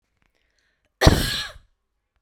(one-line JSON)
{"cough_length": "2.2 s", "cough_amplitude": 32767, "cough_signal_mean_std_ratio": 0.28, "survey_phase": "beta (2021-08-13 to 2022-03-07)", "age": "18-44", "gender": "Female", "wearing_mask": "No", "symptom_none": true, "smoker_status": "Current smoker (e-cigarettes or vapes only)", "respiratory_condition_asthma": false, "respiratory_condition_other": false, "recruitment_source": "REACT", "submission_delay": "3 days", "covid_test_result": "Negative", "covid_test_method": "RT-qPCR"}